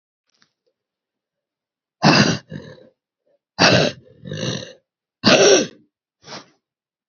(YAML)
exhalation_length: 7.1 s
exhalation_amplitude: 32767
exhalation_signal_mean_std_ratio: 0.34
survey_phase: beta (2021-08-13 to 2022-03-07)
age: 45-64
gender: Female
wearing_mask: 'No'
symptom_cough_any: true
symptom_runny_or_blocked_nose: true
symptom_fatigue: true
symptom_fever_high_temperature: true
symptom_headache: true
symptom_loss_of_taste: true
symptom_onset: 2 days
smoker_status: Never smoked
respiratory_condition_asthma: false
respiratory_condition_other: false
recruitment_source: Test and Trace
submission_delay: 1 day
covid_test_result: Positive
covid_test_method: RT-qPCR
covid_ct_value: 17.2
covid_ct_gene: ORF1ab gene
covid_ct_mean: 17.5
covid_viral_load: 1800000 copies/ml
covid_viral_load_category: High viral load (>1M copies/ml)